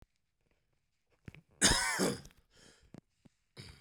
{"cough_length": "3.8 s", "cough_amplitude": 8611, "cough_signal_mean_std_ratio": 0.31, "survey_phase": "beta (2021-08-13 to 2022-03-07)", "age": "65+", "gender": "Male", "wearing_mask": "No", "symptom_none": true, "smoker_status": "Ex-smoker", "respiratory_condition_asthma": false, "respiratory_condition_other": false, "recruitment_source": "REACT", "submission_delay": "3 days", "covid_test_result": "Negative", "covid_test_method": "RT-qPCR"}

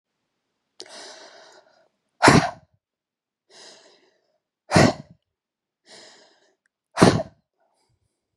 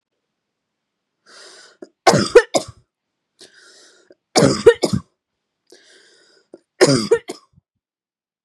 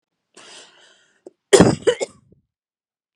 {"exhalation_length": "8.4 s", "exhalation_amplitude": 32768, "exhalation_signal_mean_std_ratio": 0.23, "three_cough_length": "8.4 s", "three_cough_amplitude": 32768, "three_cough_signal_mean_std_ratio": 0.27, "cough_length": "3.2 s", "cough_amplitude": 32768, "cough_signal_mean_std_ratio": 0.25, "survey_phase": "beta (2021-08-13 to 2022-03-07)", "age": "18-44", "gender": "Female", "wearing_mask": "No", "symptom_none": true, "smoker_status": "Ex-smoker", "respiratory_condition_asthma": false, "respiratory_condition_other": false, "recruitment_source": "REACT", "submission_delay": "2 days", "covid_test_result": "Negative", "covid_test_method": "RT-qPCR", "influenza_a_test_result": "Unknown/Void", "influenza_b_test_result": "Unknown/Void"}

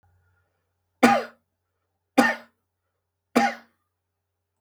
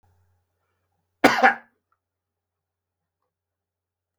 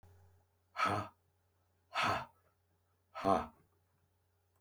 {"three_cough_length": "4.6 s", "three_cough_amplitude": 32314, "three_cough_signal_mean_std_ratio": 0.26, "cough_length": "4.2 s", "cough_amplitude": 32766, "cough_signal_mean_std_ratio": 0.19, "exhalation_length": "4.6 s", "exhalation_amplitude": 4811, "exhalation_signal_mean_std_ratio": 0.34, "survey_phase": "beta (2021-08-13 to 2022-03-07)", "age": "65+", "gender": "Male", "wearing_mask": "No", "symptom_cough_any": true, "symptom_onset": "2 days", "smoker_status": "Ex-smoker", "respiratory_condition_asthma": false, "respiratory_condition_other": false, "recruitment_source": "REACT", "submission_delay": "3 days", "covid_test_result": "Negative", "covid_test_method": "RT-qPCR", "influenza_a_test_result": "Unknown/Void", "influenza_b_test_result": "Unknown/Void"}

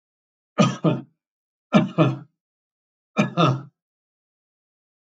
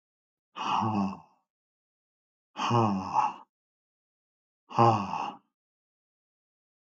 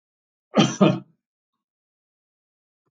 {"three_cough_length": "5.0 s", "three_cough_amplitude": 21731, "three_cough_signal_mean_std_ratio": 0.35, "exhalation_length": "6.8 s", "exhalation_amplitude": 13142, "exhalation_signal_mean_std_ratio": 0.4, "cough_length": "2.9 s", "cough_amplitude": 25352, "cough_signal_mean_std_ratio": 0.26, "survey_phase": "alpha (2021-03-01 to 2021-08-12)", "age": "65+", "gender": "Male", "wearing_mask": "No", "symptom_none": true, "smoker_status": "Never smoked", "respiratory_condition_asthma": false, "respiratory_condition_other": false, "recruitment_source": "REACT", "submission_delay": "1 day", "covid_test_result": "Negative", "covid_test_method": "RT-qPCR"}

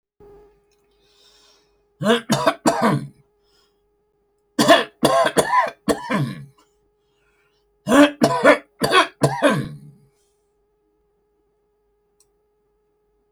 {"three_cough_length": "13.3 s", "three_cough_amplitude": 27248, "three_cough_signal_mean_std_ratio": 0.38, "survey_phase": "alpha (2021-03-01 to 2021-08-12)", "age": "65+", "gender": "Male", "wearing_mask": "No", "symptom_none": true, "smoker_status": "Never smoked", "respiratory_condition_asthma": false, "respiratory_condition_other": false, "recruitment_source": "REACT", "submission_delay": "4 days", "covid_test_result": "Negative", "covid_test_method": "RT-qPCR"}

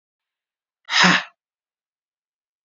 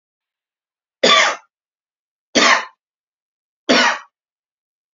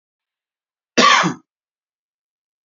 {"exhalation_length": "2.6 s", "exhalation_amplitude": 30080, "exhalation_signal_mean_std_ratio": 0.27, "three_cough_length": "4.9 s", "three_cough_amplitude": 32561, "three_cough_signal_mean_std_ratio": 0.33, "cough_length": "2.6 s", "cough_amplitude": 32768, "cough_signal_mean_std_ratio": 0.29, "survey_phase": "beta (2021-08-13 to 2022-03-07)", "age": "45-64", "gender": "Male", "wearing_mask": "No", "symptom_runny_or_blocked_nose": true, "smoker_status": "Never smoked", "respiratory_condition_asthma": false, "respiratory_condition_other": false, "recruitment_source": "REACT", "submission_delay": "2 days", "covid_test_result": "Negative", "covid_test_method": "RT-qPCR", "influenza_a_test_result": "Negative", "influenza_b_test_result": "Negative"}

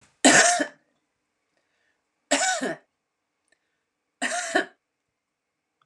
{"three_cough_length": "5.9 s", "three_cough_amplitude": 30998, "three_cough_signal_mean_std_ratio": 0.32, "survey_phase": "beta (2021-08-13 to 2022-03-07)", "age": "65+", "gender": "Female", "wearing_mask": "No", "symptom_none": true, "smoker_status": "Never smoked", "respiratory_condition_asthma": false, "respiratory_condition_other": false, "recruitment_source": "REACT", "submission_delay": "3 days", "covid_test_result": "Negative", "covid_test_method": "RT-qPCR", "influenza_a_test_result": "Negative", "influenza_b_test_result": "Negative"}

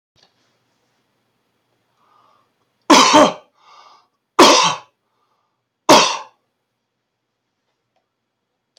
{"three_cough_length": "8.8 s", "three_cough_amplitude": 32768, "three_cough_signal_mean_std_ratio": 0.27, "survey_phase": "beta (2021-08-13 to 2022-03-07)", "age": "65+", "gender": "Male", "wearing_mask": "No", "symptom_shortness_of_breath": true, "symptom_fatigue": true, "smoker_status": "Ex-smoker", "respiratory_condition_asthma": true, "respiratory_condition_other": false, "recruitment_source": "REACT", "submission_delay": "3 days", "covid_test_result": "Negative", "covid_test_method": "RT-qPCR"}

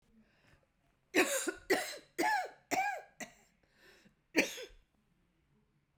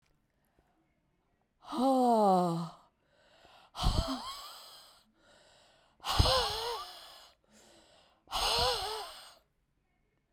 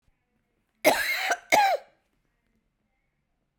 {"three_cough_length": "6.0 s", "three_cough_amplitude": 7089, "three_cough_signal_mean_std_ratio": 0.39, "exhalation_length": "10.3 s", "exhalation_amplitude": 9518, "exhalation_signal_mean_std_ratio": 0.44, "cough_length": "3.6 s", "cough_amplitude": 22192, "cough_signal_mean_std_ratio": 0.36, "survey_phase": "beta (2021-08-13 to 2022-03-07)", "age": "65+", "gender": "Female", "wearing_mask": "No", "symptom_cough_any": true, "symptom_runny_or_blocked_nose": true, "symptom_diarrhoea": true, "symptom_fatigue": true, "symptom_headache": true, "smoker_status": "Never smoked", "respiratory_condition_asthma": false, "respiratory_condition_other": false, "recruitment_source": "Test and Trace", "submission_delay": "2 days", "covid_test_result": "Positive", "covid_test_method": "RT-qPCR", "covid_ct_value": 14.9, "covid_ct_gene": "ORF1ab gene", "covid_ct_mean": 15.2, "covid_viral_load": "10000000 copies/ml", "covid_viral_load_category": "High viral load (>1M copies/ml)"}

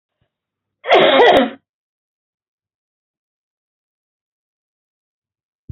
{"cough_length": "5.7 s", "cough_amplitude": 32071, "cough_signal_mean_std_ratio": 0.27, "survey_phase": "beta (2021-08-13 to 2022-03-07)", "age": "45-64", "gender": "Female", "wearing_mask": "No", "symptom_cough_any": true, "smoker_status": "Never smoked", "respiratory_condition_asthma": false, "respiratory_condition_other": false, "recruitment_source": "Test and Trace", "submission_delay": "0 days", "covid_test_result": "Negative", "covid_test_method": "LFT"}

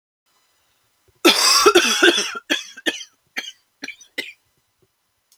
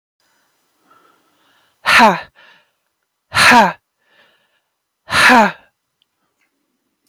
{"cough_length": "5.4 s", "cough_amplitude": 31987, "cough_signal_mean_std_ratio": 0.38, "exhalation_length": "7.1 s", "exhalation_amplitude": 32768, "exhalation_signal_mean_std_ratio": 0.32, "survey_phase": "beta (2021-08-13 to 2022-03-07)", "age": "18-44", "gender": "Female", "wearing_mask": "No", "symptom_none": true, "smoker_status": "Ex-smoker", "respiratory_condition_asthma": false, "respiratory_condition_other": false, "recruitment_source": "REACT", "submission_delay": "1 day", "covid_test_result": "Negative", "covid_test_method": "RT-qPCR"}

